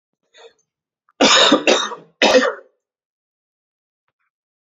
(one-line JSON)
{"three_cough_length": "4.6 s", "three_cough_amplitude": 32382, "three_cough_signal_mean_std_ratio": 0.36, "survey_phase": "beta (2021-08-13 to 2022-03-07)", "age": "18-44", "gender": "Male", "wearing_mask": "No", "symptom_cough_any": true, "symptom_runny_or_blocked_nose": true, "symptom_fever_high_temperature": true, "symptom_headache": true, "symptom_change_to_sense_of_smell_or_taste": true, "symptom_onset": "9 days", "smoker_status": "Never smoked", "respiratory_condition_asthma": false, "respiratory_condition_other": false, "recruitment_source": "Test and Trace", "submission_delay": "2 days", "covid_test_result": "Positive", "covid_test_method": "RT-qPCR", "covid_ct_value": 23.6, "covid_ct_gene": "ORF1ab gene", "covid_ct_mean": 23.7, "covid_viral_load": "17000 copies/ml", "covid_viral_load_category": "Low viral load (10K-1M copies/ml)"}